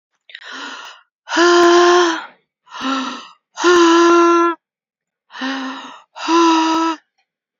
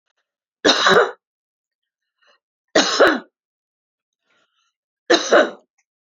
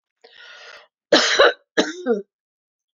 exhalation_length: 7.6 s
exhalation_amplitude: 29476
exhalation_signal_mean_std_ratio: 0.55
three_cough_length: 6.1 s
three_cough_amplitude: 29205
three_cough_signal_mean_std_ratio: 0.34
cough_length: 3.0 s
cough_amplitude: 29101
cough_signal_mean_std_ratio: 0.37
survey_phase: beta (2021-08-13 to 2022-03-07)
age: 45-64
gender: Female
wearing_mask: 'No'
symptom_none: true
smoker_status: Never smoked
respiratory_condition_asthma: false
respiratory_condition_other: false
recruitment_source: REACT
submission_delay: 2 days
covid_test_result: Negative
covid_test_method: RT-qPCR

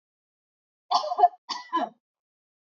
cough_length: 2.7 s
cough_amplitude: 13605
cough_signal_mean_std_ratio: 0.31
survey_phase: beta (2021-08-13 to 2022-03-07)
age: 45-64
gender: Female
wearing_mask: 'No'
symptom_none: true
smoker_status: Never smoked
respiratory_condition_asthma: false
respiratory_condition_other: false
recruitment_source: REACT
submission_delay: 1 day
covid_test_result: Negative
covid_test_method: RT-qPCR
influenza_a_test_result: Negative
influenza_b_test_result: Negative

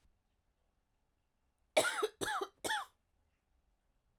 cough_length: 4.2 s
cough_amplitude: 5042
cough_signal_mean_std_ratio: 0.31
survey_phase: beta (2021-08-13 to 2022-03-07)
age: 18-44
gender: Female
wearing_mask: 'No'
symptom_cough_any: true
symptom_runny_or_blocked_nose: true
symptom_diarrhoea: true
symptom_fatigue: true
symptom_loss_of_taste: true
symptom_onset: 3 days
smoker_status: Never smoked
respiratory_condition_asthma: false
respiratory_condition_other: false
recruitment_source: Test and Trace
submission_delay: 1 day
covid_test_result: Positive
covid_test_method: RT-qPCR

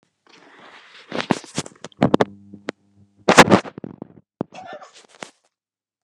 cough_length: 6.0 s
cough_amplitude: 32768
cough_signal_mean_std_ratio: 0.24
survey_phase: beta (2021-08-13 to 2022-03-07)
age: 65+
gender: Male
wearing_mask: 'No'
symptom_none: true
smoker_status: Never smoked
respiratory_condition_asthma: false
respiratory_condition_other: false
recruitment_source: REACT
submission_delay: 2 days
covid_test_result: Negative
covid_test_method: RT-qPCR
influenza_a_test_result: Negative
influenza_b_test_result: Negative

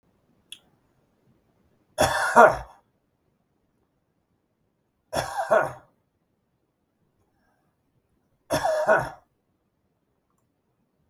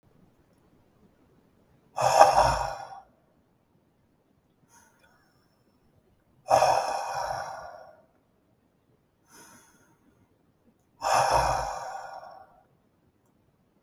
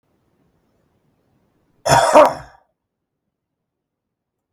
three_cough_length: 11.1 s
three_cough_amplitude: 32767
three_cough_signal_mean_std_ratio: 0.26
exhalation_length: 13.8 s
exhalation_amplitude: 32766
exhalation_signal_mean_std_ratio: 0.33
cough_length: 4.5 s
cough_amplitude: 32768
cough_signal_mean_std_ratio: 0.25
survey_phase: beta (2021-08-13 to 2022-03-07)
age: 65+
gender: Male
wearing_mask: 'No'
symptom_none: true
smoker_status: Ex-smoker
respiratory_condition_asthma: false
respiratory_condition_other: true
recruitment_source: Test and Trace
submission_delay: 3 days
covid_test_result: Negative
covid_test_method: RT-qPCR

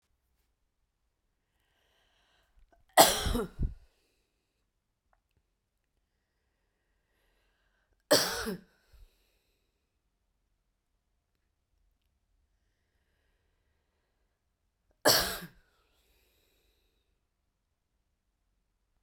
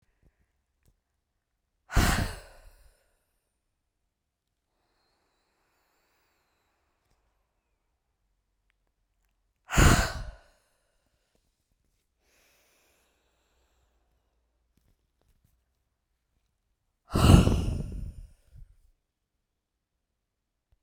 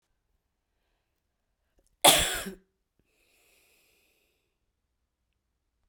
three_cough_length: 19.0 s
three_cough_amplitude: 24890
three_cough_signal_mean_std_ratio: 0.18
exhalation_length: 20.8 s
exhalation_amplitude: 24097
exhalation_signal_mean_std_ratio: 0.2
cough_length: 5.9 s
cough_amplitude: 20662
cough_signal_mean_std_ratio: 0.17
survey_phase: beta (2021-08-13 to 2022-03-07)
age: 45-64
gender: Female
wearing_mask: 'No'
symptom_runny_or_blocked_nose: true
symptom_onset: 12 days
smoker_status: Never smoked
respiratory_condition_asthma: false
respiratory_condition_other: false
recruitment_source: REACT
submission_delay: 1 day
covid_test_result: Negative
covid_test_method: RT-qPCR
influenza_a_test_result: Unknown/Void
influenza_b_test_result: Unknown/Void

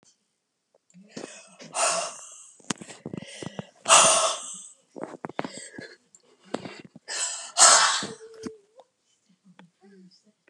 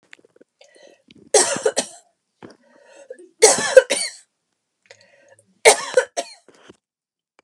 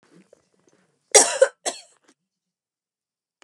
exhalation_length: 10.5 s
exhalation_amplitude: 29246
exhalation_signal_mean_std_ratio: 0.33
three_cough_length: 7.4 s
three_cough_amplitude: 32768
three_cough_signal_mean_std_ratio: 0.27
cough_length: 3.4 s
cough_amplitude: 32748
cough_signal_mean_std_ratio: 0.21
survey_phase: beta (2021-08-13 to 2022-03-07)
age: 45-64
gender: Female
wearing_mask: 'No'
symptom_none: true
smoker_status: Never smoked
respiratory_condition_asthma: false
respiratory_condition_other: false
recruitment_source: REACT
submission_delay: 5 days
covid_test_result: Negative
covid_test_method: RT-qPCR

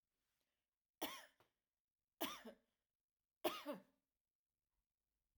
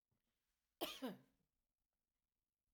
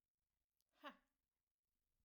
three_cough_length: 5.4 s
three_cough_amplitude: 1786
three_cough_signal_mean_std_ratio: 0.26
cough_length: 2.7 s
cough_amplitude: 1097
cough_signal_mean_std_ratio: 0.26
exhalation_length: 2.0 s
exhalation_amplitude: 249
exhalation_signal_mean_std_ratio: 0.2
survey_phase: alpha (2021-03-01 to 2021-08-12)
age: 45-64
gender: Female
wearing_mask: 'No'
symptom_none: true
smoker_status: Never smoked
respiratory_condition_asthma: false
respiratory_condition_other: false
recruitment_source: REACT
submission_delay: 1 day
covid_test_result: Negative
covid_test_method: RT-qPCR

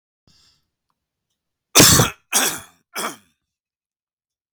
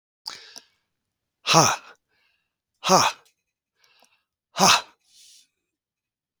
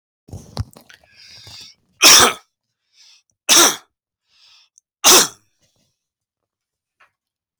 cough_length: 4.5 s
cough_amplitude: 32768
cough_signal_mean_std_ratio: 0.28
exhalation_length: 6.4 s
exhalation_amplitude: 29792
exhalation_signal_mean_std_ratio: 0.27
three_cough_length: 7.6 s
three_cough_amplitude: 32768
three_cough_signal_mean_std_ratio: 0.28
survey_phase: beta (2021-08-13 to 2022-03-07)
age: 65+
gender: Male
wearing_mask: 'No'
symptom_none: true
symptom_onset: 2 days
smoker_status: Ex-smoker
respiratory_condition_asthma: false
respiratory_condition_other: false
recruitment_source: REACT
submission_delay: 4 days
covid_test_result: Negative
covid_test_method: RT-qPCR
influenza_a_test_result: Negative
influenza_b_test_result: Negative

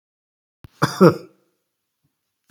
cough_length: 2.5 s
cough_amplitude: 32767
cough_signal_mean_std_ratio: 0.22
survey_phase: beta (2021-08-13 to 2022-03-07)
age: 45-64
gender: Male
wearing_mask: 'No'
symptom_none: true
smoker_status: Never smoked
respiratory_condition_asthma: false
respiratory_condition_other: false
recruitment_source: REACT
submission_delay: 8 days
covid_test_result: Negative
covid_test_method: RT-qPCR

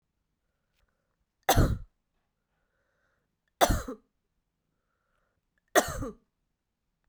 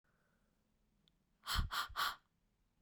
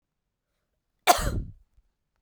three_cough_length: 7.1 s
three_cough_amplitude: 14621
three_cough_signal_mean_std_ratio: 0.24
exhalation_length: 2.8 s
exhalation_amplitude: 1986
exhalation_signal_mean_std_ratio: 0.37
cough_length: 2.2 s
cough_amplitude: 26467
cough_signal_mean_std_ratio: 0.26
survey_phase: beta (2021-08-13 to 2022-03-07)
age: 18-44
gender: Female
wearing_mask: 'No'
symptom_cough_any: true
symptom_runny_or_blocked_nose: true
symptom_sore_throat: true
symptom_fatigue: true
symptom_fever_high_temperature: true
symptom_headache: true
symptom_other: true
symptom_onset: 3 days
smoker_status: Never smoked
respiratory_condition_asthma: false
respiratory_condition_other: false
recruitment_source: Test and Trace
submission_delay: 1 day
covid_test_result: Positive
covid_test_method: RT-qPCR
covid_ct_value: 31.5
covid_ct_gene: N gene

